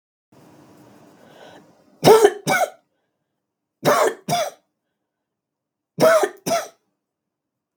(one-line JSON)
{"three_cough_length": "7.8 s", "three_cough_amplitude": 32768, "three_cough_signal_mean_std_ratio": 0.33, "survey_phase": "beta (2021-08-13 to 2022-03-07)", "age": "45-64", "gender": "Female", "wearing_mask": "No", "symptom_runny_or_blocked_nose": true, "symptom_fatigue": true, "symptom_headache": true, "smoker_status": "Ex-smoker", "respiratory_condition_asthma": false, "respiratory_condition_other": false, "recruitment_source": "Test and Trace", "submission_delay": "2 days", "covid_test_result": "Positive", "covid_test_method": "RT-qPCR", "covid_ct_value": 20.6, "covid_ct_gene": "N gene"}